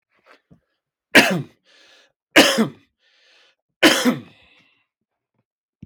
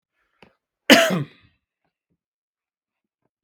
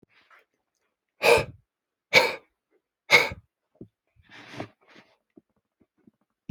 three_cough_length: 5.9 s
three_cough_amplitude: 32590
three_cough_signal_mean_std_ratio: 0.29
cough_length: 3.4 s
cough_amplitude: 32767
cough_signal_mean_std_ratio: 0.21
exhalation_length: 6.5 s
exhalation_amplitude: 25260
exhalation_signal_mean_std_ratio: 0.23
survey_phase: beta (2021-08-13 to 2022-03-07)
age: 45-64
gender: Male
wearing_mask: 'No'
symptom_none: true
symptom_onset: 5 days
smoker_status: Never smoked
respiratory_condition_asthma: false
respiratory_condition_other: false
recruitment_source: Test and Trace
submission_delay: 4 days
covid_test_result: Negative
covid_test_method: RT-qPCR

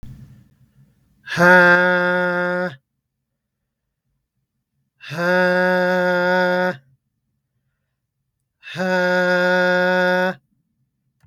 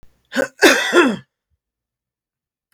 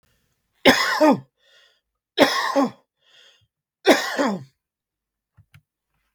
exhalation_length: 11.3 s
exhalation_amplitude: 32766
exhalation_signal_mean_std_ratio: 0.53
cough_length: 2.7 s
cough_amplitude: 32768
cough_signal_mean_std_ratio: 0.37
three_cough_length: 6.1 s
three_cough_amplitude: 32766
three_cough_signal_mean_std_ratio: 0.35
survey_phase: beta (2021-08-13 to 2022-03-07)
age: 18-44
gender: Male
wearing_mask: 'No'
symptom_runny_or_blocked_nose: true
symptom_fatigue: true
symptom_onset: 2 days
smoker_status: Ex-smoker
respiratory_condition_asthma: false
respiratory_condition_other: false
recruitment_source: Test and Trace
submission_delay: 1 day
covid_test_result: Negative
covid_test_method: RT-qPCR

